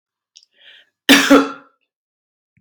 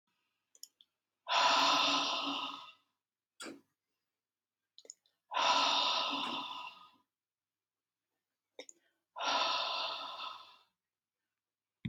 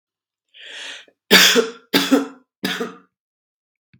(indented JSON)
{
  "cough_length": "2.6 s",
  "cough_amplitude": 32767,
  "cough_signal_mean_std_ratio": 0.3,
  "exhalation_length": "11.9 s",
  "exhalation_amplitude": 4357,
  "exhalation_signal_mean_std_ratio": 0.45,
  "three_cough_length": "4.0 s",
  "three_cough_amplitude": 32768,
  "three_cough_signal_mean_std_ratio": 0.36,
  "survey_phase": "beta (2021-08-13 to 2022-03-07)",
  "age": "45-64",
  "gender": "Male",
  "wearing_mask": "No",
  "symptom_none": true,
  "smoker_status": "Never smoked",
  "respiratory_condition_asthma": false,
  "respiratory_condition_other": false,
  "recruitment_source": "REACT",
  "submission_delay": "1 day",
  "covid_test_result": "Negative",
  "covid_test_method": "RT-qPCR"
}